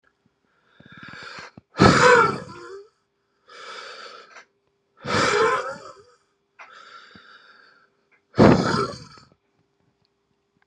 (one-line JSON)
{"exhalation_length": "10.7 s", "exhalation_amplitude": 32734, "exhalation_signal_mean_std_ratio": 0.33, "survey_phase": "beta (2021-08-13 to 2022-03-07)", "age": "18-44", "gender": "Male", "wearing_mask": "No", "symptom_shortness_of_breath": true, "symptom_fatigue": true, "symptom_onset": "12 days", "smoker_status": "Never smoked", "respiratory_condition_asthma": false, "respiratory_condition_other": false, "recruitment_source": "REACT", "submission_delay": "2 days", "covid_test_result": "Negative", "covid_test_method": "RT-qPCR", "influenza_a_test_result": "Negative", "influenza_b_test_result": "Negative"}